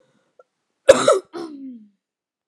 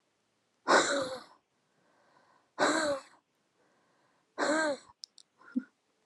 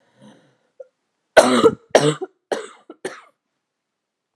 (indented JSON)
{
  "cough_length": "2.5 s",
  "cough_amplitude": 32768,
  "cough_signal_mean_std_ratio": 0.27,
  "exhalation_length": "6.1 s",
  "exhalation_amplitude": 9129,
  "exhalation_signal_mean_std_ratio": 0.38,
  "three_cough_length": "4.4 s",
  "three_cough_amplitude": 32768,
  "three_cough_signal_mean_std_ratio": 0.29,
  "survey_phase": "beta (2021-08-13 to 2022-03-07)",
  "age": "18-44",
  "gender": "Female",
  "wearing_mask": "No",
  "symptom_cough_any": true,
  "symptom_new_continuous_cough": true,
  "symptom_headache": true,
  "symptom_onset": "3 days",
  "smoker_status": "Never smoked",
  "respiratory_condition_asthma": true,
  "respiratory_condition_other": false,
  "recruitment_source": "Test and Trace",
  "submission_delay": "1 day",
  "covid_test_result": "Positive",
  "covid_test_method": "RT-qPCR",
  "covid_ct_value": 26.4,
  "covid_ct_gene": "ORF1ab gene"
}